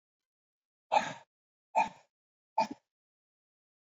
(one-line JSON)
{"exhalation_length": "3.8 s", "exhalation_amplitude": 6306, "exhalation_signal_mean_std_ratio": 0.24, "survey_phase": "beta (2021-08-13 to 2022-03-07)", "age": "45-64", "gender": "Male", "wearing_mask": "No", "symptom_none": true, "symptom_onset": "9 days", "smoker_status": "Never smoked", "respiratory_condition_asthma": false, "respiratory_condition_other": false, "recruitment_source": "REACT", "submission_delay": "1 day", "covid_test_result": "Negative", "covid_test_method": "RT-qPCR", "influenza_a_test_result": "Unknown/Void", "influenza_b_test_result": "Unknown/Void"}